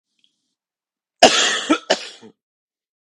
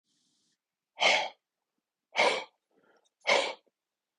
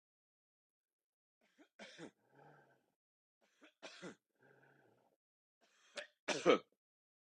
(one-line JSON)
{"cough_length": "3.2 s", "cough_amplitude": 32768, "cough_signal_mean_std_ratio": 0.3, "exhalation_length": "4.2 s", "exhalation_amplitude": 10309, "exhalation_signal_mean_std_ratio": 0.33, "three_cough_length": "7.3 s", "three_cough_amplitude": 4184, "three_cough_signal_mean_std_ratio": 0.18, "survey_phase": "beta (2021-08-13 to 2022-03-07)", "age": "45-64", "gender": "Male", "wearing_mask": "No", "symptom_cough_any": true, "symptom_runny_or_blocked_nose": true, "symptom_shortness_of_breath": true, "symptom_sore_throat": true, "symptom_fatigue": true, "symptom_headache": true, "smoker_status": "Never smoked", "respiratory_condition_asthma": false, "respiratory_condition_other": false, "recruitment_source": "Test and Trace", "submission_delay": "2 days", "covid_test_result": "Positive", "covid_test_method": "RT-qPCR"}